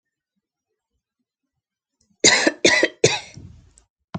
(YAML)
three_cough_length: 4.2 s
three_cough_amplitude: 32768
three_cough_signal_mean_std_ratio: 0.31
survey_phase: alpha (2021-03-01 to 2021-08-12)
age: 18-44
gender: Female
wearing_mask: 'No'
symptom_none: true
smoker_status: Never smoked
respiratory_condition_asthma: false
respiratory_condition_other: false
recruitment_source: REACT
submission_delay: 2 days
covid_test_result: Negative
covid_test_method: RT-qPCR